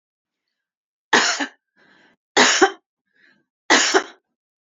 {"three_cough_length": "4.8 s", "three_cough_amplitude": 28886, "three_cough_signal_mean_std_ratio": 0.34, "survey_phase": "beta (2021-08-13 to 2022-03-07)", "age": "45-64", "gender": "Female", "wearing_mask": "No", "symptom_headache": true, "smoker_status": "Never smoked", "respiratory_condition_asthma": false, "respiratory_condition_other": false, "recruitment_source": "REACT", "submission_delay": "3 days", "covid_test_result": "Negative", "covid_test_method": "RT-qPCR", "influenza_a_test_result": "Negative", "influenza_b_test_result": "Negative"}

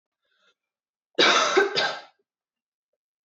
{"cough_length": "3.2 s", "cough_amplitude": 17689, "cough_signal_mean_std_ratio": 0.38, "survey_phase": "alpha (2021-03-01 to 2021-08-12)", "age": "18-44", "gender": "Female", "wearing_mask": "No", "symptom_none": true, "smoker_status": "Never smoked", "respiratory_condition_asthma": false, "respiratory_condition_other": false, "recruitment_source": "REACT", "submission_delay": "1 day", "covid_test_result": "Negative", "covid_test_method": "RT-qPCR"}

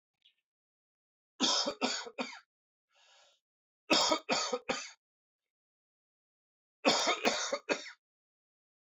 {"three_cough_length": "9.0 s", "three_cough_amplitude": 8147, "three_cough_signal_mean_std_ratio": 0.38, "survey_phase": "alpha (2021-03-01 to 2021-08-12)", "age": "45-64", "gender": "Male", "wearing_mask": "No", "symptom_cough_any": true, "symptom_shortness_of_breath": true, "symptom_fatigue": true, "symptom_change_to_sense_of_smell_or_taste": true, "symptom_onset": "5 days", "smoker_status": "Ex-smoker", "respiratory_condition_asthma": false, "respiratory_condition_other": false, "recruitment_source": "Test and Trace", "submission_delay": "4 days", "covid_test_result": "Positive", "covid_test_method": "RT-qPCR", "covid_ct_value": 18.5, "covid_ct_gene": "N gene", "covid_ct_mean": 18.6, "covid_viral_load": "790000 copies/ml", "covid_viral_load_category": "Low viral load (10K-1M copies/ml)"}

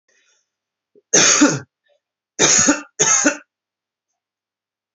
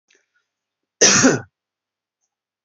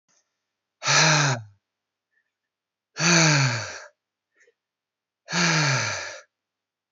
{"three_cough_length": "4.9 s", "three_cough_amplitude": 31232, "three_cough_signal_mean_std_ratio": 0.4, "cough_length": "2.6 s", "cough_amplitude": 32053, "cough_signal_mean_std_ratio": 0.3, "exhalation_length": "6.9 s", "exhalation_amplitude": 18911, "exhalation_signal_mean_std_ratio": 0.44, "survey_phase": "beta (2021-08-13 to 2022-03-07)", "age": "18-44", "gender": "Male", "wearing_mask": "No", "symptom_none": true, "smoker_status": "Never smoked", "respiratory_condition_asthma": false, "respiratory_condition_other": false, "recruitment_source": "REACT", "submission_delay": "1 day", "covid_test_result": "Negative", "covid_test_method": "RT-qPCR", "influenza_a_test_result": "Negative", "influenza_b_test_result": "Negative"}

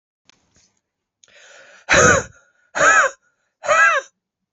{"exhalation_length": "4.5 s", "exhalation_amplitude": 30032, "exhalation_signal_mean_std_ratio": 0.4, "survey_phase": "beta (2021-08-13 to 2022-03-07)", "age": "45-64", "gender": "Female", "wearing_mask": "No", "symptom_runny_or_blocked_nose": true, "smoker_status": "Never smoked", "respiratory_condition_asthma": false, "respiratory_condition_other": false, "recruitment_source": "Test and Trace", "submission_delay": "2 days", "covid_test_result": "Positive", "covid_test_method": "LFT"}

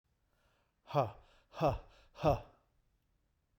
{"exhalation_length": "3.6 s", "exhalation_amplitude": 4372, "exhalation_signal_mean_std_ratio": 0.32, "survey_phase": "beta (2021-08-13 to 2022-03-07)", "age": "45-64", "gender": "Male", "wearing_mask": "No", "symptom_none": true, "smoker_status": "Never smoked", "respiratory_condition_asthma": false, "respiratory_condition_other": false, "recruitment_source": "REACT", "submission_delay": "2 days", "covid_test_result": "Negative", "covid_test_method": "RT-qPCR"}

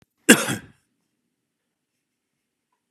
{"cough_length": "2.9 s", "cough_amplitude": 32768, "cough_signal_mean_std_ratio": 0.18, "survey_phase": "beta (2021-08-13 to 2022-03-07)", "age": "65+", "gender": "Male", "wearing_mask": "No", "symptom_none": true, "smoker_status": "Ex-smoker", "respiratory_condition_asthma": false, "respiratory_condition_other": false, "recruitment_source": "REACT", "submission_delay": "2 days", "covid_test_result": "Negative", "covid_test_method": "RT-qPCR", "influenza_a_test_result": "Negative", "influenza_b_test_result": "Negative"}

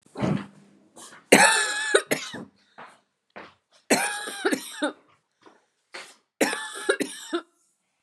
{"three_cough_length": "8.0 s", "three_cough_amplitude": 32767, "three_cough_signal_mean_std_ratio": 0.39, "survey_phase": "beta (2021-08-13 to 2022-03-07)", "age": "45-64", "gender": "Female", "wearing_mask": "No", "symptom_new_continuous_cough": true, "smoker_status": "Ex-smoker", "respiratory_condition_asthma": false, "respiratory_condition_other": false, "recruitment_source": "Test and Trace", "submission_delay": "2 days", "covid_test_result": "Positive", "covid_test_method": "RT-qPCR", "covid_ct_value": 21.6, "covid_ct_gene": "ORF1ab gene"}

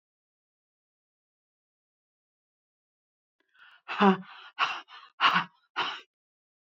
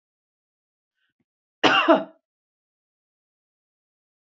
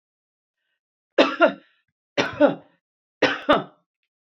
{"exhalation_length": "6.7 s", "exhalation_amplitude": 16508, "exhalation_signal_mean_std_ratio": 0.25, "cough_length": "4.3 s", "cough_amplitude": 27345, "cough_signal_mean_std_ratio": 0.22, "three_cough_length": "4.4 s", "three_cough_amplitude": 26490, "three_cough_signal_mean_std_ratio": 0.32, "survey_phase": "beta (2021-08-13 to 2022-03-07)", "age": "65+", "gender": "Female", "wearing_mask": "No", "symptom_none": true, "smoker_status": "Never smoked", "recruitment_source": "REACT", "submission_delay": "2 days", "covid_test_result": "Negative", "covid_test_method": "RT-qPCR", "influenza_a_test_result": "Unknown/Void", "influenza_b_test_result": "Unknown/Void"}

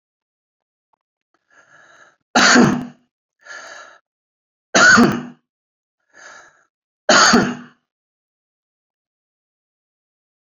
{"three_cough_length": "10.6 s", "three_cough_amplitude": 32768, "three_cough_signal_mean_std_ratio": 0.3, "survey_phase": "beta (2021-08-13 to 2022-03-07)", "age": "65+", "gender": "Male", "wearing_mask": "No", "symptom_none": true, "smoker_status": "Never smoked", "respiratory_condition_asthma": false, "respiratory_condition_other": false, "recruitment_source": "REACT", "submission_delay": "3 days", "covid_test_result": "Negative", "covid_test_method": "RT-qPCR"}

